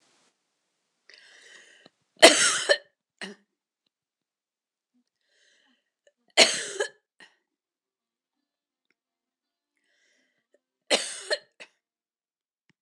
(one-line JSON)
{"three_cough_length": "12.8 s", "three_cough_amplitude": 26028, "three_cough_signal_mean_std_ratio": 0.19, "survey_phase": "beta (2021-08-13 to 2022-03-07)", "age": "65+", "gender": "Female", "wearing_mask": "No", "symptom_cough_any": true, "symptom_runny_or_blocked_nose": true, "symptom_shortness_of_breath": true, "smoker_status": "Never smoked", "respiratory_condition_asthma": true, "respiratory_condition_other": false, "recruitment_source": "REACT", "submission_delay": "3 days", "covid_test_result": "Negative", "covid_test_method": "RT-qPCR"}